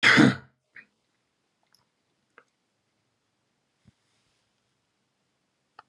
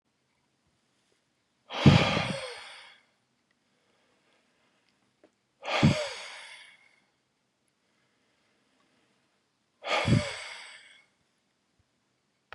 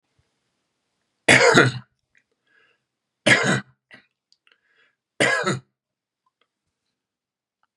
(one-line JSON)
{"cough_length": "5.9 s", "cough_amplitude": 20753, "cough_signal_mean_std_ratio": 0.19, "exhalation_length": "12.5 s", "exhalation_amplitude": 18698, "exhalation_signal_mean_std_ratio": 0.26, "three_cough_length": "7.8 s", "three_cough_amplitude": 32768, "three_cough_signal_mean_std_ratio": 0.29, "survey_phase": "beta (2021-08-13 to 2022-03-07)", "age": "45-64", "gender": "Male", "wearing_mask": "No", "symptom_none": true, "smoker_status": "Ex-smoker", "respiratory_condition_asthma": false, "respiratory_condition_other": false, "recruitment_source": "REACT", "submission_delay": "1 day", "covid_test_result": "Negative", "covid_test_method": "RT-qPCR", "influenza_a_test_result": "Negative", "influenza_b_test_result": "Negative"}